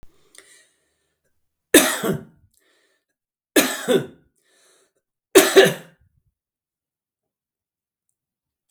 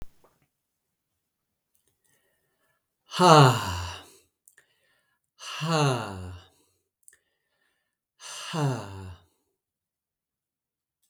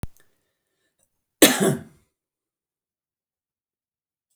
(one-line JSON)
{"three_cough_length": "8.7 s", "three_cough_amplitude": 32768, "three_cough_signal_mean_std_ratio": 0.25, "exhalation_length": "11.1 s", "exhalation_amplitude": 28142, "exhalation_signal_mean_std_ratio": 0.27, "cough_length": "4.4 s", "cough_amplitude": 32768, "cough_signal_mean_std_ratio": 0.2, "survey_phase": "beta (2021-08-13 to 2022-03-07)", "age": "45-64", "gender": "Male", "wearing_mask": "No", "symptom_none": true, "smoker_status": "Never smoked", "respiratory_condition_asthma": false, "respiratory_condition_other": false, "recruitment_source": "REACT", "submission_delay": "1 day", "covid_test_result": "Negative", "covid_test_method": "RT-qPCR"}